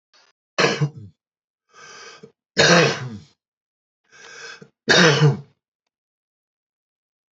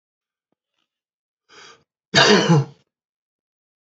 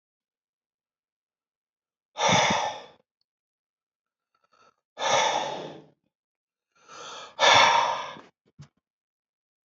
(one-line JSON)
{"three_cough_length": "7.3 s", "three_cough_amplitude": 28187, "three_cough_signal_mean_std_ratio": 0.34, "cough_length": "3.8 s", "cough_amplitude": 30137, "cough_signal_mean_std_ratio": 0.3, "exhalation_length": "9.6 s", "exhalation_amplitude": 18133, "exhalation_signal_mean_std_ratio": 0.34, "survey_phase": "beta (2021-08-13 to 2022-03-07)", "age": "65+", "gender": "Male", "wearing_mask": "No", "symptom_none": true, "smoker_status": "Never smoked", "respiratory_condition_asthma": false, "respiratory_condition_other": false, "recruitment_source": "REACT", "submission_delay": "2 days", "covid_test_result": "Negative", "covid_test_method": "RT-qPCR", "influenza_a_test_result": "Negative", "influenza_b_test_result": "Negative"}